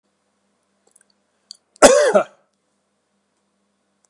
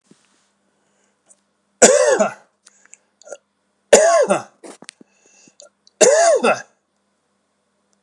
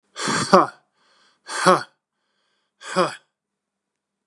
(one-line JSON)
{"cough_length": "4.1 s", "cough_amplitude": 32768, "cough_signal_mean_std_ratio": 0.24, "three_cough_length": "8.0 s", "three_cough_amplitude": 32768, "three_cough_signal_mean_std_ratio": 0.35, "exhalation_length": "4.3 s", "exhalation_amplitude": 32768, "exhalation_signal_mean_std_ratio": 0.31, "survey_phase": "beta (2021-08-13 to 2022-03-07)", "age": "45-64", "gender": "Male", "wearing_mask": "No", "symptom_none": true, "smoker_status": "Ex-smoker", "respiratory_condition_asthma": false, "respiratory_condition_other": false, "recruitment_source": "REACT", "submission_delay": "1 day", "covid_test_result": "Negative", "covid_test_method": "RT-qPCR", "influenza_a_test_result": "Negative", "influenza_b_test_result": "Negative"}